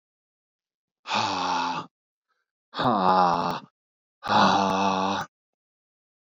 {"exhalation_length": "6.3 s", "exhalation_amplitude": 17853, "exhalation_signal_mean_std_ratio": 0.51, "survey_phase": "beta (2021-08-13 to 2022-03-07)", "age": "18-44", "gender": "Male", "wearing_mask": "No", "symptom_none": true, "smoker_status": "Ex-smoker", "respiratory_condition_asthma": false, "respiratory_condition_other": false, "recruitment_source": "REACT", "submission_delay": "2 days", "covid_test_result": "Negative", "covid_test_method": "RT-qPCR", "influenza_a_test_result": "Negative", "influenza_b_test_result": "Negative"}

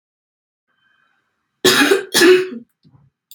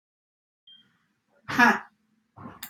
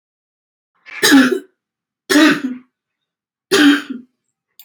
{"cough_length": "3.3 s", "cough_amplitude": 31196, "cough_signal_mean_std_ratio": 0.38, "exhalation_length": "2.7 s", "exhalation_amplitude": 15713, "exhalation_signal_mean_std_ratio": 0.25, "three_cough_length": "4.6 s", "three_cough_amplitude": 32768, "three_cough_signal_mean_std_ratio": 0.4, "survey_phase": "alpha (2021-03-01 to 2021-08-12)", "age": "18-44", "gender": "Female", "wearing_mask": "No", "symptom_cough_any": true, "symptom_fatigue": true, "symptom_fever_high_temperature": true, "symptom_onset": "5 days", "smoker_status": "Never smoked", "respiratory_condition_asthma": false, "respiratory_condition_other": false, "recruitment_source": "Test and Trace", "submission_delay": "1 day", "covid_test_result": "Positive", "covid_test_method": "RT-qPCR", "covid_ct_value": 16.9, "covid_ct_gene": "N gene", "covid_ct_mean": 17.1, "covid_viral_load": "2500000 copies/ml", "covid_viral_load_category": "High viral load (>1M copies/ml)"}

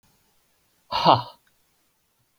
{"exhalation_length": "2.4 s", "exhalation_amplitude": 27746, "exhalation_signal_mean_std_ratio": 0.24, "survey_phase": "beta (2021-08-13 to 2022-03-07)", "age": "45-64", "gender": "Male", "wearing_mask": "No", "symptom_none": true, "smoker_status": "Never smoked", "respiratory_condition_asthma": false, "respiratory_condition_other": false, "recruitment_source": "REACT", "submission_delay": "3 days", "covid_test_result": "Negative", "covid_test_method": "RT-qPCR"}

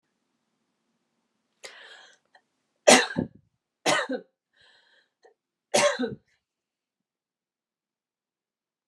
{"three_cough_length": "8.9 s", "three_cough_amplitude": 28260, "three_cough_signal_mean_std_ratio": 0.22, "survey_phase": "beta (2021-08-13 to 2022-03-07)", "age": "45-64", "gender": "Female", "wearing_mask": "No", "symptom_none": true, "symptom_onset": "12 days", "smoker_status": "Never smoked", "respiratory_condition_asthma": true, "respiratory_condition_other": false, "recruitment_source": "REACT", "submission_delay": "2 days", "covid_test_result": "Negative", "covid_test_method": "RT-qPCR", "influenza_a_test_result": "Negative", "influenza_b_test_result": "Negative"}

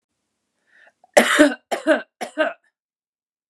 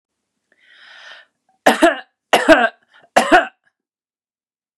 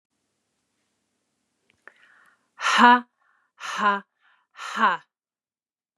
{"cough_length": "3.5 s", "cough_amplitude": 29204, "cough_signal_mean_std_ratio": 0.33, "three_cough_length": "4.8 s", "three_cough_amplitude": 29204, "three_cough_signal_mean_std_ratio": 0.32, "exhalation_length": "6.0 s", "exhalation_amplitude": 26116, "exhalation_signal_mean_std_ratio": 0.28, "survey_phase": "beta (2021-08-13 to 2022-03-07)", "age": "45-64", "gender": "Female", "wearing_mask": "No", "symptom_none": true, "smoker_status": "Never smoked", "respiratory_condition_asthma": false, "respiratory_condition_other": false, "recruitment_source": "REACT", "submission_delay": "1 day", "covid_test_result": "Negative", "covid_test_method": "RT-qPCR", "influenza_a_test_result": "Negative", "influenza_b_test_result": "Negative"}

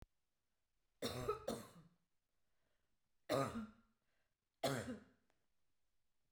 {"three_cough_length": "6.3 s", "three_cough_amplitude": 1381, "three_cough_signal_mean_std_ratio": 0.35, "survey_phase": "beta (2021-08-13 to 2022-03-07)", "age": "45-64", "gender": "Female", "wearing_mask": "No", "symptom_none": true, "smoker_status": "Never smoked", "respiratory_condition_asthma": false, "respiratory_condition_other": false, "recruitment_source": "REACT", "submission_delay": "1 day", "covid_test_result": "Negative", "covid_test_method": "RT-qPCR", "influenza_a_test_result": "Negative", "influenza_b_test_result": "Negative"}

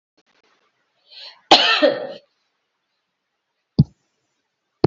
{"cough_length": "4.9 s", "cough_amplitude": 32767, "cough_signal_mean_std_ratio": 0.25, "survey_phase": "beta (2021-08-13 to 2022-03-07)", "age": "65+", "gender": "Female", "wearing_mask": "No", "symptom_none": true, "smoker_status": "Ex-smoker", "respiratory_condition_asthma": false, "respiratory_condition_other": false, "recruitment_source": "REACT", "submission_delay": "1 day", "covid_test_result": "Negative", "covid_test_method": "RT-qPCR", "influenza_a_test_result": "Negative", "influenza_b_test_result": "Negative"}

